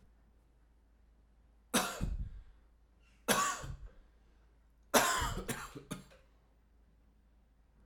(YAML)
three_cough_length: 7.9 s
three_cough_amplitude: 8940
three_cough_signal_mean_std_ratio: 0.38
survey_phase: alpha (2021-03-01 to 2021-08-12)
age: 45-64
gender: Male
wearing_mask: 'No'
symptom_fatigue: true
symptom_change_to_sense_of_smell_or_taste: true
symptom_onset: 12 days
smoker_status: Never smoked
respiratory_condition_asthma: false
respiratory_condition_other: false
recruitment_source: REACT
submission_delay: 1 day
covid_test_result: Negative
covid_test_method: RT-qPCR